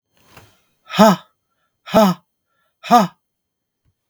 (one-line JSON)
{"exhalation_length": "4.1 s", "exhalation_amplitude": 32768, "exhalation_signal_mean_std_ratio": 0.31, "survey_phase": "beta (2021-08-13 to 2022-03-07)", "age": "45-64", "gender": "Male", "wearing_mask": "No", "symptom_cough_any": true, "symptom_runny_or_blocked_nose": true, "symptom_abdominal_pain": true, "symptom_diarrhoea": true, "symptom_fatigue": true, "symptom_fever_high_temperature": true, "symptom_headache": true, "symptom_change_to_sense_of_smell_or_taste": true, "symptom_loss_of_taste": true, "symptom_onset": "4 days", "smoker_status": "Never smoked", "respiratory_condition_asthma": false, "respiratory_condition_other": false, "recruitment_source": "Test and Trace", "submission_delay": "1 day", "covid_test_result": "Negative", "covid_test_method": "RT-qPCR"}